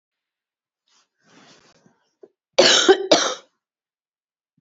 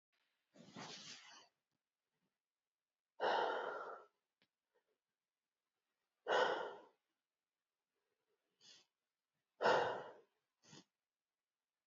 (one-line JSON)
{"cough_length": "4.6 s", "cough_amplitude": 32455, "cough_signal_mean_std_ratio": 0.28, "exhalation_length": "11.9 s", "exhalation_amplitude": 2300, "exhalation_signal_mean_std_ratio": 0.29, "survey_phase": "beta (2021-08-13 to 2022-03-07)", "age": "65+", "gender": "Female", "wearing_mask": "No", "symptom_cough_any": true, "symptom_runny_or_blocked_nose": true, "symptom_fatigue": true, "symptom_fever_high_temperature": true, "symptom_headache": true, "smoker_status": "Ex-smoker", "respiratory_condition_asthma": false, "respiratory_condition_other": false, "recruitment_source": "Test and Trace", "submission_delay": "1 day", "covid_test_result": "Positive", "covid_test_method": "RT-qPCR", "covid_ct_value": 17.9, "covid_ct_gene": "ORF1ab gene", "covid_ct_mean": 18.5, "covid_viral_load": "830000 copies/ml", "covid_viral_load_category": "Low viral load (10K-1M copies/ml)"}